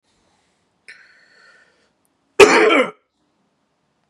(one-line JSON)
{"cough_length": "4.1 s", "cough_amplitude": 32768, "cough_signal_mean_std_ratio": 0.26, "survey_phase": "beta (2021-08-13 to 2022-03-07)", "age": "45-64", "gender": "Male", "wearing_mask": "No", "symptom_cough_any": true, "symptom_runny_or_blocked_nose": true, "symptom_sore_throat": true, "symptom_onset": "3 days", "smoker_status": "Never smoked", "respiratory_condition_asthma": true, "respiratory_condition_other": false, "recruitment_source": "Test and Trace", "submission_delay": "2 days", "covid_test_result": "Positive", "covid_test_method": "ePCR"}